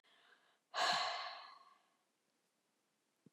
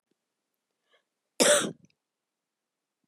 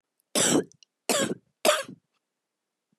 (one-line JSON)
{"exhalation_length": "3.3 s", "exhalation_amplitude": 2228, "exhalation_signal_mean_std_ratio": 0.36, "cough_length": "3.1 s", "cough_amplitude": 13822, "cough_signal_mean_std_ratio": 0.24, "three_cough_length": "3.0 s", "three_cough_amplitude": 13790, "three_cough_signal_mean_std_ratio": 0.39, "survey_phase": "beta (2021-08-13 to 2022-03-07)", "age": "45-64", "gender": "Female", "wearing_mask": "No", "symptom_cough_any": true, "symptom_new_continuous_cough": true, "symptom_runny_or_blocked_nose": true, "symptom_shortness_of_breath": true, "symptom_sore_throat": true, "symptom_abdominal_pain": true, "symptom_fatigue": true, "symptom_headache": true, "symptom_loss_of_taste": true, "symptom_onset": "2 days", "smoker_status": "Never smoked", "respiratory_condition_asthma": true, "respiratory_condition_other": true, "recruitment_source": "Test and Trace", "submission_delay": "1 day", "covid_test_result": "Positive", "covid_test_method": "ePCR"}